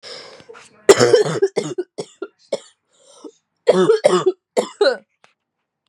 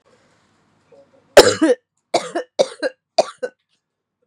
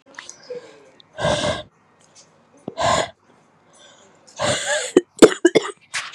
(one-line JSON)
{"cough_length": "5.9 s", "cough_amplitude": 32768, "cough_signal_mean_std_ratio": 0.4, "three_cough_length": "4.3 s", "three_cough_amplitude": 32768, "three_cough_signal_mean_std_ratio": 0.28, "exhalation_length": "6.1 s", "exhalation_amplitude": 32768, "exhalation_signal_mean_std_ratio": 0.34, "survey_phase": "beta (2021-08-13 to 2022-03-07)", "age": "18-44", "gender": "Female", "wearing_mask": "No", "symptom_cough_any": true, "symptom_new_continuous_cough": true, "symptom_shortness_of_breath": true, "symptom_sore_throat": true, "symptom_fever_high_temperature": true, "symptom_headache": true, "symptom_loss_of_taste": true, "symptom_other": true, "smoker_status": "Current smoker (e-cigarettes or vapes only)", "respiratory_condition_asthma": false, "respiratory_condition_other": false, "recruitment_source": "Test and Trace", "submission_delay": "2 days", "covid_test_result": "Positive", "covid_test_method": "LFT"}